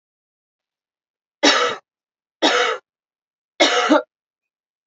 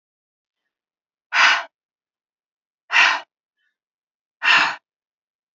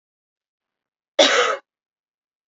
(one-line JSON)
{"three_cough_length": "4.9 s", "three_cough_amplitude": 29594, "three_cough_signal_mean_std_ratio": 0.37, "exhalation_length": "5.5 s", "exhalation_amplitude": 24957, "exhalation_signal_mean_std_ratio": 0.31, "cough_length": "2.5 s", "cough_amplitude": 28527, "cough_signal_mean_std_ratio": 0.3, "survey_phase": "beta (2021-08-13 to 2022-03-07)", "age": "45-64", "gender": "Female", "wearing_mask": "No", "symptom_cough_any": true, "symptom_runny_or_blocked_nose": true, "symptom_headache": true, "symptom_other": true, "smoker_status": "Current smoker (1 to 10 cigarettes per day)", "respiratory_condition_asthma": false, "respiratory_condition_other": false, "recruitment_source": "Test and Trace", "submission_delay": "1 day", "covid_test_result": "Positive", "covid_test_method": "RT-qPCR", "covid_ct_value": 25.2, "covid_ct_gene": "ORF1ab gene", "covid_ct_mean": 25.4, "covid_viral_load": "4600 copies/ml", "covid_viral_load_category": "Minimal viral load (< 10K copies/ml)"}